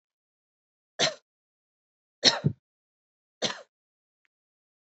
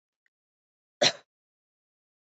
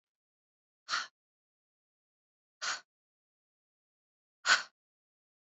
{"three_cough_length": "4.9 s", "three_cough_amplitude": 23283, "three_cough_signal_mean_std_ratio": 0.2, "cough_length": "2.3 s", "cough_amplitude": 13153, "cough_signal_mean_std_ratio": 0.16, "exhalation_length": "5.5 s", "exhalation_amplitude": 11745, "exhalation_signal_mean_std_ratio": 0.19, "survey_phase": "beta (2021-08-13 to 2022-03-07)", "age": "18-44", "gender": "Female", "wearing_mask": "No", "symptom_cough_any": true, "symptom_sore_throat": true, "symptom_fatigue": true, "smoker_status": "Current smoker (1 to 10 cigarettes per day)", "respiratory_condition_asthma": false, "respiratory_condition_other": false, "recruitment_source": "REACT", "submission_delay": "1 day", "covid_test_result": "Negative", "covid_test_method": "RT-qPCR", "influenza_a_test_result": "Negative", "influenza_b_test_result": "Negative"}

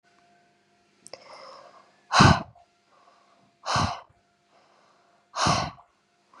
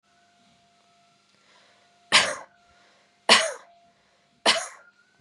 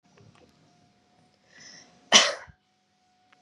{"exhalation_length": "6.4 s", "exhalation_amplitude": 23539, "exhalation_signal_mean_std_ratio": 0.28, "three_cough_length": "5.2 s", "three_cough_amplitude": 30266, "three_cough_signal_mean_std_ratio": 0.26, "cough_length": "3.4 s", "cough_amplitude": 30575, "cough_signal_mean_std_ratio": 0.2, "survey_phase": "beta (2021-08-13 to 2022-03-07)", "age": "18-44", "gender": "Female", "wearing_mask": "No", "symptom_change_to_sense_of_smell_or_taste": true, "symptom_onset": "12 days", "smoker_status": "Ex-smoker", "respiratory_condition_asthma": false, "respiratory_condition_other": false, "recruitment_source": "REACT", "submission_delay": "1 day", "covid_test_result": "Negative", "covid_test_method": "RT-qPCR", "influenza_a_test_result": "Negative", "influenza_b_test_result": "Negative"}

